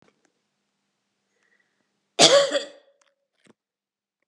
{"cough_length": "4.3 s", "cough_amplitude": 28680, "cough_signal_mean_std_ratio": 0.23, "survey_phase": "beta (2021-08-13 to 2022-03-07)", "age": "18-44", "gender": "Female", "wearing_mask": "No", "symptom_cough_any": true, "symptom_runny_or_blocked_nose": true, "symptom_shortness_of_breath": true, "symptom_sore_throat": true, "symptom_abdominal_pain": true, "symptom_fatigue": true, "symptom_fever_high_temperature": true, "symptom_headache": true, "symptom_change_to_sense_of_smell_or_taste": true, "symptom_other": true, "symptom_onset": "4 days", "smoker_status": "Ex-smoker", "respiratory_condition_asthma": false, "respiratory_condition_other": false, "recruitment_source": "Test and Trace", "submission_delay": "1 day", "covid_test_result": "Positive", "covid_test_method": "RT-qPCR", "covid_ct_value": 17.5, "covid_ct_gene": "N gene"}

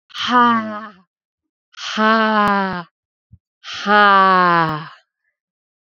{"exhalation_length": "5.8 s", "exhalation_amplitude": 28155, "exhalation_signal_mean_std_ratio": 0.52, "survey_phase": "alpha (2021-03-01 to 2021-08-12)", "age": "18-44", "gender": "Female", "wearing_mask": "No", "symptom_cough_any": true, "symptom_new_continuous_cough": true, "symptom_fatigue": true, "symptom_change_to_sense_of_smell_or_taste": true, "symptom_loss_of_taste": true, "smoker_status": "Never smoked", "respiratory_condition_asthma": false, "respiratory_condition_other": false, "recruitment_source": "Test and Trace", "submission_delay": "2 days", "covid_test_result": "Positive", "covid_test_method": "RT-qPCR", "covid_ct_value": 18.5, "covid_ct_gene": "N gene", "covid_ct_mean": 19.1, "covid_viral_load": "530000 copies/ml", "covid_viral_load_category": "Low viral load (10K-1M copies/ml)"}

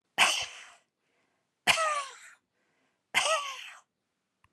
{"exhalation_length": "4.5 s", "exhalation_amplitude": 14595, "exhalation_signal_mean_std_ratio": 0.38, "survey_phase": "beta (2021-08-13 to 2022-03-07)", "age": "65+", "gender": "Female", "wearing_mask": "No", "symptom_none": true, "smoker_status": "Never smoked", "respiratory_condition_asthma": false, "respiratory_condition_other": false, "recruitment_source": "REACT", "submission_delay": "1 day", "covid_test_result": "Negative", "covid_test_method": "RT-qPCR", "influenza_a_test_result": "Negative", "influenza_b_test_result": "Negative"}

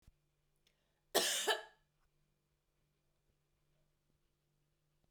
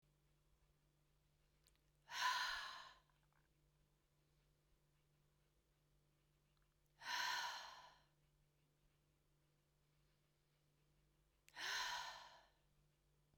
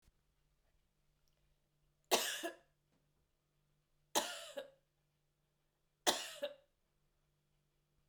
{"cough_length": "5.1 s", "cough_amplitude": 4908, "cough_signal_mean_std_ratio": 0.23, "exhalation_length": "13.4 s", "exhalation_amplitude": 978, "exhalation_signal_mean_std_ratio": 0.34, "three_cough_length": "8.1 s", "three_cough_amplitude": 5017, "three_cough_signal_mean_std_ratio": 0.25, "survey_phase": "beta (2021-08-13 to 2022-03-07)", "age": "18-44", "gender": "Female", "wearing_mask": "No", "symptom_cough_any": true, "symptom_loss_of_taste": true, "symptom_onset": "9 days", "smoker_status": "Never smoked", "respiratory_condition_asthma": true, "respiratory_condition_other": false, "recruitment_source": "Test and Trace", "submission_delay": "2 days", "covid_test_result": "Positive", "covid_test_method": "ePCR"}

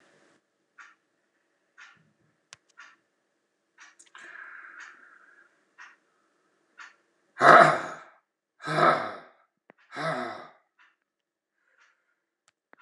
{"exhalation_length": "12.8 s", "exhalation_amplitude": 26028, "exhalation_signal_mean_std_ratio": 0.21, "survey_phase": "beta (2021-08-13 to 2022-03-07)", "age": "65+", "gender": "Male", "wearing_mask": "No", "symptom_cough_any": true, "symptom_sore_throat": true, "symptom_onset": "6 days", "smoker_status": "Never smoked", "respiratory_condition_asthma": false, "respiratory_condition_other": false, "recruitment_source": "Test and Trace", "submission_delay": "1 day", "covid_test_result": "Positive", "covid_test_method": "RT-qPCR", "covid_ct_value": 21.0, "covid_ct_gene": "ORF1ab gene", "covid_ct_mean": 21.7, "covid_viral_load": "79000 copies/ml", "covid_viral_load_category": "Low viral load (10K-1M copies/ml)"}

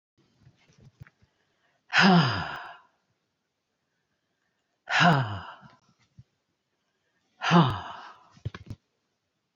{"exhalation_length": "9.6 s", "exhalation_amplitude": 15274, "exhalation_signal_mean_std_ratio": 0.31, "survey_phase": "alpha (2021-03-01 to 2021-08-12)", "age": "65+", "gender": "Female", "wearing_mask": "No", "symptom_none": true, "smoker_status": "Never smoked", "respiratory_condition_asthma": false, "respiratory_condition_other": false, "recruitment_source": "REACT", "submission_delay": "1 day", "covid_test_result": "Negative", "covid_test_method": "RT-qPCR"}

